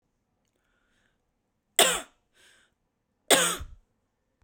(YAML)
exhalation_length: 4.4 s
exhalation_amplitude: 27637
exhalation_signal_mean_std_ratio: 0.24
survey_phase: beta (2021-08-13 to 2022-03-07)
age: 45-64
gender: Female
wearing_mask: 'Yes'
symptom_none: true
smoker_status: Current smoker (1 to 10 cigarettes per day)
respiratory_condition_asthma: false
respiratory_condition_other: false
recruitment_source: REACT
submission_delay: 3 days
covid_test_result: Negative
covid_test_method: RT-qPCR